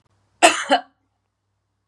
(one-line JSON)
{"cough_length": "1.9 s", "cough_amplitude": 32672, "cough_signal_mean_std_ratio": 0.28, "survey_phase": "beta (2021-08-13 to 2022-03-07)", "age": "45-64", "gender": "Female", "wearing_mask": "No", "symptom_runny_or_blocked_nose": true, "symptom_fatigue": true, "symptom_onset": "13 days", "smoker_status": "Never smoked", "respiratory_condition_asthma": false, "respiratory_condition_other": false, "recruitment_source": "REACT", "submission_delay": "2 days", "covid_test_result": "Negative", "covid_test_method": "RT-qPCR", "influenza_a_test_result": "Negative", "influenza_b_test_result": "Negative"}